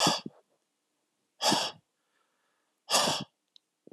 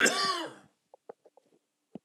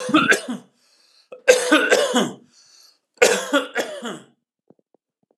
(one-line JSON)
{"exhalation_length": "3.9 s", "exhalation_amplitude": 9139, "exhalation_signal_mean_std_ratio": 0.36, "cough_length": "2.0 s", "cough_amplitude": 10168, "cough_signal_mean_std_ratio": 0.38, "three_cough_length": "5.4 s", "three_cough_amplitude": 32767, "three_cough_signal_mean_std_ratio": 0.44, "survey_phase": "beta (2021-08-13 to 2022-03-07)", "age": "45-64", "gender": "Male", "wearing_mask": "No", "symptom_none": true, "smoker_status": "Never smoked", "respiratory_condition_asthma": false, "respiratory_condition_other": false, "recruitment_source": "REACT", "submission_delay": "1 day", "covid_test_result": "Negative", "covid_test_method": "RT-qPCR"}